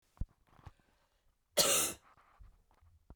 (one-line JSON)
{"cough_length": "3.2 s", "cough_amplitude": 6486, "cough_signal_mean_std_ratio": 0.3, "survey_phase": "beta (2021-08-13 to 2022-03-07)", "age": "45-64", "gender": "Female", "wearing_mask": "No", "symptom_cough_any": true, "symptom_runny_or_blocked_nose": true, "symptom_shortness_of_breath": true, "symptom_sore_throat": true, "symptom_fatigue": true, "symptom_headache": true, "symptom_onset": "2 days", "smoker_status": "Ex-smoker", "respiratory_condition_asthma": false, "respiratory_condition_other": false, "recruitment_source": "Test and Trace", "submission_delay": "1 day", "covid_test_result": "Positive", "covid_test_method": "RT-qPCR"}